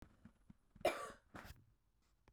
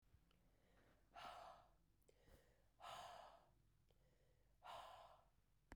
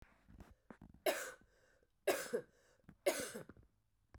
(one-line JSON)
{"cough_length": "2.3 s", "cough_amplitude": 2151, "cough_signal_mean_std_ratio": 0.29, "exhalation_length": "5.8 s", "exhalation_amplitude": 225, "exhalation_signal_mean_std_ratio": 0.62, "three_cough_length": "4.2 s", "three_cough_amplitude": 2771, "three_cough_signal_mean_std_ratio": 0.35, "survey_phase": "beta (2021-08-13 to 2022-03-07)", "age": "18-44", "gender": "Female", "wearing_mask": "No", "symptom_cough_any": true, "symptom_runny_or_blocked_nose": true, "symptom_fatigue": true, "symptom_loss_of_taste": true, "symptom_onset": "3 days", "smoker_status": "Never smoked", "respiratory_condition_asthma": false, "respiratory_condition_other": false, "recruitment_source": "Test and Trace", "submission_delay": "2 days", "covid_test_result": "Positive", "covid_test_method": "RT-qPCR", "covid_ct_value": 18.4, "covid_ct_gene": "ORF1ab gene", "covid_ct_mean": 18.8, "covid_viral_load": "660000 copies/ml", "covid_viral_load_category": "Low viral load (10K-1M copies/ml)"}